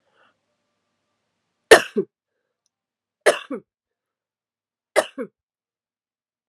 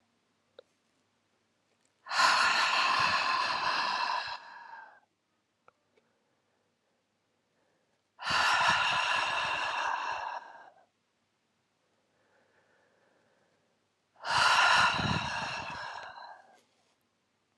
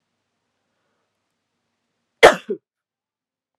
{"three_cough_length": "6.5 s", "three_cough_amplitude": 32768, "three_cough_signal_mean_std_ratio": 0.16, "exhalation_length": "17.6 s", "exhalation_amplitude": 10000, "exhalation_signal_mean_std_ratio": 0.49, "cough_length": "3.6 s", "cough_amplitude": 32768, "cough_signal_mean_std_ratio": 0.14, "survey_phase": "beta (2021-08-13 to 2022-03-07)", "age": "18-44", "gender": "Female", "wearing_mask": "No", "symptom_cough_any": true, "symptom_runny_or_blocked_nose": true, "symptom_shortness_of_breath": true, "symptom_headache": true, "symptom_other": true, "smoker_status": "Never smoked", "respiratory_condition_asthma": true, "respiratory_condition_other": false, "recruitment_source": "Test and Trace", "submission_delay": "2 days", "covid_test_result": "Positive", "covid_test_method": "RT-qPCR", "covid_ct_value": 20.3, "covid_ct_gene": "ORF1ab gene", "covid_ct_mean": 20.8, "covid_viral_load": "150000 copies/ml", "covid_viral_load_category": "Low viral load (10K-1M copies/ml)"}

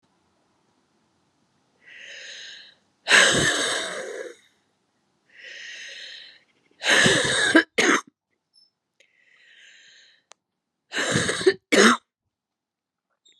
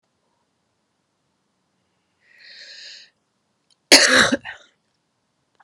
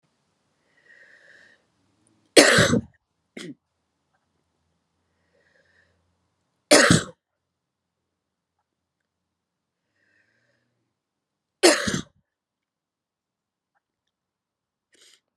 {"exhalation_length": "13.4 s", "exhalation_amplitude": 25478, "exhalation_signal_mean_std_ratio": 0.37, "cough_length": "5.6 s", "cough_amplitude": 32768, "cough_signal_mean_std_ratio": 0.22, "three_cough_length": "15.4 s", "three_cough_amplitude": 32768, "three_cough_signal_mean_std_ratio": 0.2, "survey_phase": "beta (2021-08-13 to 2022-03-07)", "age": "45-64", "gender": "Female", "wearing_mask": "No", "symptom_cough_any": true, "symptom_runny_or_blocked_nose": true, "symptom_sore_throat": true, "symptom_headache": true, "symptom_change_to_sense_of_smell_or_taste": true, "symptom_onset": "2 days", "smoker_status": "Never smoked", "respiratory_condition_asthma": false, "respiratory_condition_other": false, "recruitment_source": "Test and Trace", "submission_delay": "2 days", "covid_test_result": "Positive", "covid_test_method": "RT-qPCR", "covid_ct_value": 20.7, "covid_ct_gene": "ORF1ab gene", "covid_ct_mean": 21.6, "covid_viral_load": "81000 copies/ml", "covid_viral_load_category": "Low viral load (10K-1M copies/ml)"}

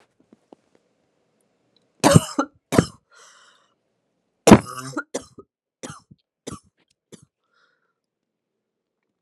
{"cough_length": "9.2 s", "cough_amplitude": 32768, "cough_signal_mean_std_ratio": 0.18, "survey_phase": "alpha (2021-03-01 to 2021-08-12)", "age": "18-44", "gender": "Female", "wearing_mask": "No", "symptom_cough_any": true, "symptom_shortness_of_breath": true, "symptom_fatigue": true, "symptom_change_to_sense_of_smell_or_taste": true, "symptom_loss_of_taste": true, "symptom_onset": "2 days", "smoker_status": "Ex-smoker", "respiratory_condition_asthma": false, "respiratory_condition_other": false, "recruitment_source": "Test and Trace", "submission_delay": "2 days", "covid_test_result": "Positive", "covid_test_method": "RT-qPCR", "covid_ct_value": 27.0, "covid_ct_gene": "ORF1ab gene", "covid_ct_mean": 27.4, "covid_viral_load": "990 copies/ml", "covid_viral_load_category": "Minimal viral load (< 10K copies/ml)"}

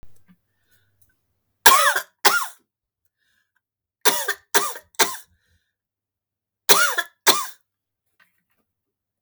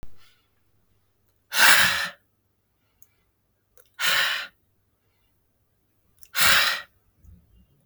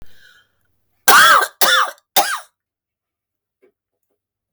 {"three_cough_length": "9.2 s", "three_cough_amplitude": 32768, "three_cough_signal_mean_std_ratio": 0.29, "exhalation_length": "7.9 s", "exhalation_amplitude": 26758, "exhalation_signal_mean_std_ratio": 0.33, "cough_length": "4.5 s", "cough_amplitude": 32768, "cough_signal_mean_std_ratio": 0.36, "survey_phase": "beta (2021-08-13 to 2022-03-07)", "age": "45-64", "gender": "Female", "wearing_mask": "No", "symptom_none": true, "smoker_status": "Ex-smoker", "respiratory_condition_asthma": false, "respiratory_condition_other": false, "recruitment_source": "REACT", "submission_delay": "2 days", "covid_test_result": "Negative", "covid_test_method": "RT-qPCR", "influenza_a_test_result": "Negative", "influenza_b_test_result": "Negative"}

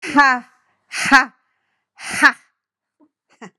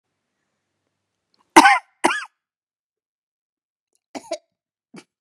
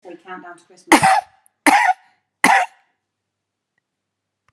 {"exhalation_length": "3.6 s", "exhalation_amplitude": 32768, "exhalation_signal_mean_std_ratio": 0.33, "cough_length": "5.2 s", "cough_amplitude": 32768, "cough_signal_mean_std_ratio": 0.19, "three_cough_length": "4.5 s", "three_cough_amplitude": 32768, "three_cough_signal_mean_std_ratio": 0.34, "survey_phase": "beta (2021-08-13 to 2022-03-07)", "age": "45-64", "gender": "Female", "wearing_mask": "No", "symptom_none": true, "smoker_status": "Prefer not to say", "respiratory_condition_asthma": false, "respiratory_condition_other": false, "recruitment_source": "REACT", "submission_delay": "0 days", "covid_test_result": "Negative", "covid_test_method": "RT-qPCR", "influenza_a_test_result": "Unknown/Void", "influenza_b_test_result": "Unknown/Void"}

